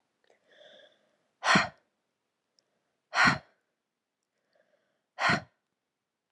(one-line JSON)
{"exhalation_length": "6.3 s", "exhalation_amplitude": 10276, "exhalation_signal_mean_std_ratio": 0.25, "survey_phase": "beta (2021-08-13 to 2022-03-07)", "age": "18-44", "gender": "Female", "wearing_mask": "No", "symptom_cough_any": true, "symptom_new_continuous_cough": true, "symptom_runny_or_blocked_nose": true, "symptom_fatigue": true, "symptom_fever_high_temperature": true, "symptom_headache": true, "symptom_other": true, "symptom_onset": "6 days", "smoker_status": "Never smoked", "respiratory_condition_asthma": true, "respiratory_condition_other": false, "recruitment_source": "Test and Trace", "submission_delay": "2 days", "covid_test_result": "Positive", "covid_test_method": "RT-qPCR", "covid_ct_value": 22.7, "covid_ct_gene": "ORF1ab gene", "covid_ct_mean": 23.0, "covid_viral_load": "28000 copies/ml", "covid_viral_load_category": "Low viral load (10K-1M copies/ml)"}